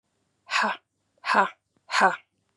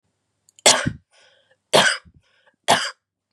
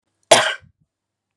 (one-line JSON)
{"exhalation_length": "2.6 s", "exhalation_amplitude": 18496, "exhalation_signal_mean_std_ratio": 0.39, "three_cough_length": "3.3 s", "three_cough_amplitude": 32767, "three_cough_signal_mean_std_ratio": 0.33, "cough_length": "1.4 s", "cough_amplitude": 32768, "cough_signal_mean_std_ratio": 0.28, "survey_phase": "beta (2021-08-13 to 2022-03-07)", "age": "18-44", "gender": "Female", "wearing_mask": "No", "symptom_runny_or_blocked_nose": true, "smoker_status": "Never smoked", "respiratory_condition_asthma": false, "respiratory_condition_other": false, "recruitment_source": "REACT", "submission_delay": "1 day", "covid_test_result": "Negative", "covid_test_method": "RT-qPCR", "covid_ct_value": 39.5, "covid_ct_gene": "N gene", "influenza_a_test_result": "Negative", "influenza_b_test_result": "Negative"}